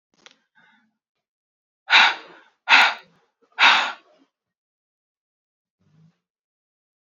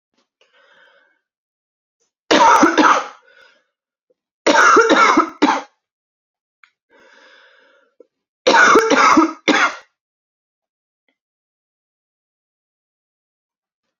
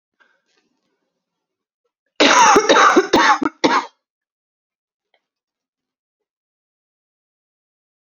{"exhalation_length": "7.2 s", "exhalation_amplitude": 29854, "exhalation_signal_mean_std_ratio": 0.26, "three_cough_length": "14.0 s", "three_cough_amplitude": 32768, "three_cough_signal_mean_std_ratio": 0.37, "cough_length": "8.0 s", "cough_amplitude": 32089, "cough_signal_mean_std_ratio": 0.33, "survey_phase": "alpha (2021-03-01 to 2021-08-12)", "age": "18-44", "gender": "Female", "wearing_mask": "No", "symptom_cough_any": true, "symptom_new_continuous_cough": true, "symptom_fatigue": true, "symptom_headache": true, "symptom_onset": "2 days", "smoker_status": "Ex-smoker", "respiratory_condition_asthma": false, "respiratory_condition_other": false, "recruitment_source": "Test and Trace", "submission_delay": "1 day", "covid_test_result": "Positive", "covid_test_method": "RT-qPCR", "covid_ct_value": 17.0, "covid_ct_gene": "ORF1ab gene", "covid_ct_mean": 17.5, "covid_viral_load": "1800000 copies/ml", "covid_viral_load_category": "High viral load (>1M copies/ml)"}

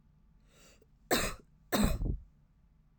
{"cough_length": "3.0 s", "cough_amplitude": 7034, "cough_signal_mean_std_ratio": 0.41, "survey_phase": "alpha (2021-03-01 to 2021-08-12)", "age": "18-44", "gender": "Female", "wearing_mask": "No", "symptom_fatigue": true, "symptom_onset": "13 days", "smoker_status": "Never smoked", "respiratory_condition_asthma": true, "respiratory_condition_other": false, "recruitment_source": "REACT", "submission_delay": "1 day", "covid_test_result": "Negative", "covid_test_method": "RT-qPCR"}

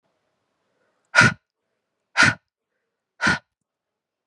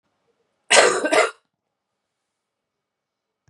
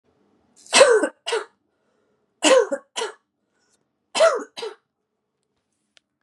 {"exhalation_length": "4.3 s", "exhalation_amplitude": 30077, "exhalation_signal_mean_std_ratio": 0.25, "cough_length": "3.5 s", "cough_amplitude": 31695, "cough_signal_mean_std_ratio": 0.29, "three_cough_length": "6.2 s", "three_cough_amplitude": 29436, "three_cough_signal_mean_std_ratio": 0.33, "survey_phase": "beta (2021-08-13 to 2022-03-07)", "age": "18-44", "gender": "Female", "wearing_mask": "No", "symptom_cough_any": true, "symptom_runny_or_blocked_nose": true, "smoker_status": "Never smoked", "respiratory_condition_asthma": false, "respiratory_condition_other": false, "recruitment_source": "Test and Trace", "submission_delay": "1 day", "covid_test_result": "Positive", "covid_test_method": "RT-qPCR", "covid_ct_value": 25.3, "covid_ct_gene": "ORF1ab gene", "covid_ct_mean": 25.3, "covid_viral_load": "4900 copies/ml", "covid_viral_load_category": "Minimal viral load (< 10K copies/ml)"}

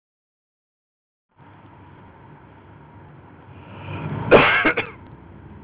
{"cough_length": "5.6 s", "cough_amplitude": 30960, "cough_signal_mean_std_ratio": 0.31, "survey_phase": "beta (2021-08-13 to 2022-03-07)", "age": "18-44", "gender": "Male", "wearing_mask": "No", "symptom_runny_or_blocked_nose": true, "symptom_onset": "8 days", "smoker_status": "Never smoked", "respiratory_condition_asthma": false, "respiratory_condition_other": false, "recruitment_source": "REACT", "submission_delay": "1 day", "covid_test_result": "Negative", "covid_test_method": "RT-qPCR", "influenza_a_test_result": "Unknown/Void", "influenza_b_test_result": "Unknown/Void"}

